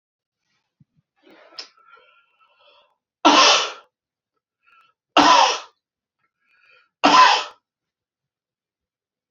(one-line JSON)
{"three_cough_length": "9.3 s", "three_cough_amplitude": 29525, "three_cough_signal_mean_std_ratio": 0.29, "survey_phase": "beta (2021-08-13 to 2022-03-07)", "age": "45-64", "gender": "Male", "wearing_mask": "No", "symptom_none": true, "smoker_status": "Never smoked", "respiratory_condition_asthma": false, "respiratory_condition_other": false, "recruitment_source": "REACT", "submission_delay": "1 day", "covid_test_result": "Negative", "covid_test_method": "RT-qPCR", "influenza_a_test_result": "Negative", "influenza_b_test_result": "Negative"}